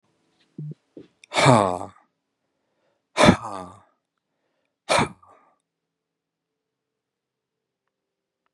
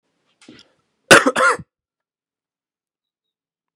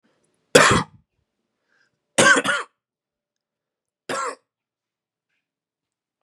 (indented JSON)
{
  "exhalation_length": "8.5 s",
  "exhalation_amplitude": 31661,
  "exhalation_signal_mean_std_ratio": 0.24,
  "cough_length": "3.8 s",
  "cough_amplitude": 32768,
  "cough_signal_mean_std_ratio": 0.23,
  "three_cough_length": "6.2 s",
  "three_cough_amplitude": 32768,
  "three_cough_signal_mean_std_ratio": 0.27,
  "survey_phase": "beta (2021-08-13 to 2022-03-07)",
  "age": "18-44",
  "gender": "Male",
  "wearing_mask": "No",
  "symptom_cough_any": true,
  "symptom_new_continuous_cough": true,
  "symptom_runny_or_blocked_nose": true,
  "symptom_shortness_of_breath": true,
  "symptom_fatigue": true,
  "symptom_headache": true,
  "symptom_change_to_sense_of_smell_or_taste": true,
  "symptom_loss_of_taste": true,
  "symptom_other": true,
  "symptom_onset": "9 days",
  "smoker_status": "Never smoked",
  "respiratory_condition_asthma": false,
  "respiratory_condition_other": false,
  "recruitment_source": "Test and Trace",
  "submission_delay": "2 days",
  "covid_test_result": "Positive",
  "covid_test_method": "RT-qPCR",
  "covid_ct_value": 14.1,
  "covid_ct_gene": "ORF1ab gene",
  "covid_ct_mean": 14.4,
  "covid_viral_load": "19000000 copies/ml",
  "covid_viral_load_category": "High viral load (>1M copies/ml)"
}